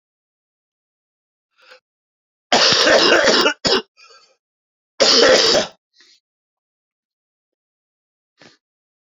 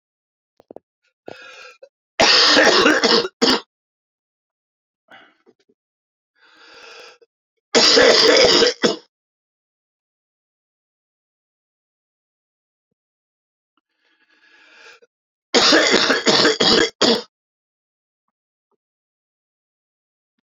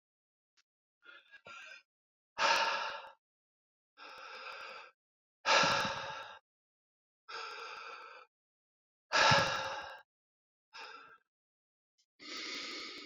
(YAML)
cough_length: 9.1 s
cough_amplitude: 32434
cough_signal_mean_std_ratio: 0.37
three_cough_length: 20.5 s
three_cough_amplitude: 32767
three_cough_signal_mean_std_ratio: 0.35
exhalation_length: 13.1 s
exhalation_amplitude: 6379
exhalation_signal_mean_std_ratio: 0.37
survey_phase: beta (2021-08-13 to 2022-03-07)
age: 45-64
gender: Male
wearing_mask: 'Yes'
symptom_cough_any: true
symptom_runny_or_blocked_nose: true
symptom_sore_throat: true
symptom_abdominal_pain: true
symptom_fatigue: true
symptom_fever_high_temperature: true
symptom_headache: true
symptom_onset: 4 days
smoker_status: Ex-smoker
respiratory_condition_asthma: false
respiratory_condition_other: false
recruitment_source: Test and Trace
submission_delay: 2 days
covid_test_result: Positive
covid_test_method: RT-qPCR
covid_ct_value: 21.0
covid_ct_gene: ORF1ab gene
covid_ct_mean: 21.9
covid_viral_load: 67000 copies/ml
covid_viral_load_category: Low viral load (10K-1M copies/ml)